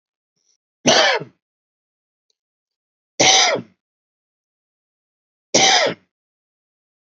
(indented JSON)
{
  "three_cough_length": "7.1 s",
  "three_cough_amplitude": 31278,
  "three_cough_signal_mean_std_ratio": 0.32,
  "survey_phase": "beta (2021-08-13 to 2022-03-07)",
  "age": "45-64",
  "gender": "Male",
  "wearing_mask": "No",
  "symptom_none": true,
  "smoker_status": "Ex-smoker",
  "respiratory_condition_asthma": false,
  "respiratory_condition_other": false,
  "recruitment_source": "REACT",
  "submission_delay": "1 day",
  "covid_test_result": "Negative",
  "covid_test_method": "RT-qPCR",
  "influenza_a_test_result": "Negative",
  "influenza_b_test_result": "Negative"
}